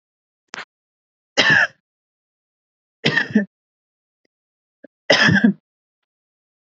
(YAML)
three_cough_length: 6.7 s
three_cough_amplitude: 29894
three_cough_signal_mean_std_ratio: 0.31
survey_phase: beta (2021-08-13 to 2022-03-07)
age: 18-44
gender: Female
wearing_mask: 'No'
symptom_none: true
smoker_status: Never smoked
respiratory_condition_asthma: false
respiratory_condition_other: false
recruitment_source: REACT
submission_delay: 1 day
covid_test_result: Negative
covid_test_method: RT-qPCR